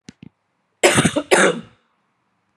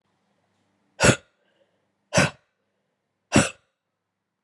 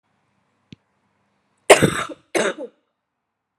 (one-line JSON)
{"cough_length": "2.6 s", "cough_amplitude": 32714, "cough_signal_mean_std_ratio": 0.38, "exhalation_length": "4.4 s", "exhalation_amplitude": 27551, "exhalation_signal_mean_std_ratio": 0.24, "three_cough_length": "3.6 s", "three_cough_amplitude": 32768, "three_cough_signal_mean_std_ratio": 0.24, "survey_phase": "alpha (2021-03-01 to 2021-08-12)", "age": "45-64", "gender": "Female", "wearing_mask": "No", "symptom_cough_any": true, "symptom_fatigue": true, "symptom_headache": true, "symptom_change_to_sense_of_smell_or_taste": true, "smoker_status": "Never smoked", "respiratory_condition_asthma": false, "respiratory_condition_other": false, "recruitment_source": "Test and Trace", "submission_delay": "2 days", "covid_test_result": "Positive", "covid_test_method": "RT-qPCR", "covid_ct_value": 19.0, "covid_ct_gene": "N gene", "covid_ct_mean": 20.0, "covid_viral_load": "270000 copies/ml", "covid_viral_load_category": "Low viral load (10K-1M copies/ml)"}